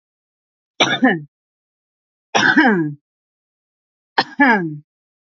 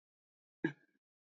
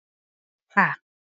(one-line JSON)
{"three_cough_length": "5.2 s", "three_cough_amplitude": 28493, "three_cough_signal_mean_std_ratio": 0.4, "cough_length": "1.3 s", "cough_amplitude": 2637, "cough_signal_mean_std_ratio": 0.17, "exhalation_length": "1.3 s", "exhalation_amplitude": 22864, "exhalation_signal_mean_std_ratio": 0.26, "survey_phase": "alpha (2021-03-01 to 2021-08-12)", "age": "18-44", "gender": "Female", "wearing_mask": "No", "symptom_none": true, "smoker_status": "Prefer not to say", "respiratory_condition_asthma": false, "respiratory_condition_other": false, "recruitment_source": "REACT", "submission_delay": "5 days", "covid_test_result": "Negative", "covid_test_method": "RT-qPCR"}